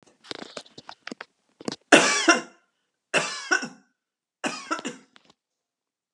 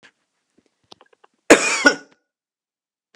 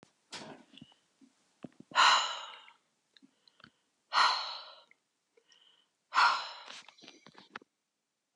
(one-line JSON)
{"three_cough_length": "6.1 s", "three_cough_amplitude": 31916, "three_cough_signal_mean_std_ratio": 0.3, "cough_length": "3.2 s", "cough_amplitude": 32768, "cough_signal_mean_std_ratio": 0.23, "exhalation_length": "8.4 s", "exhalation_amplitude": 8885, "exhalation_signal_mean_std_ratio": 0.3, "survey_phase": "beta (2021-08-13 to 2022-03-07)", "age": "65+", "gender": "Female", "wearing_mask": "No", "symptom_none": true, "symptom_onset": "6 days", "smoker_status": "Never smoked", "respiratory_condition_asthma": false, "respiratory_condition_other": false, "recruitment_source": "REACT", "submission_delay": "1 day", "covid_test_result": "Negative", "covid_test_method": "RT-qPCR"}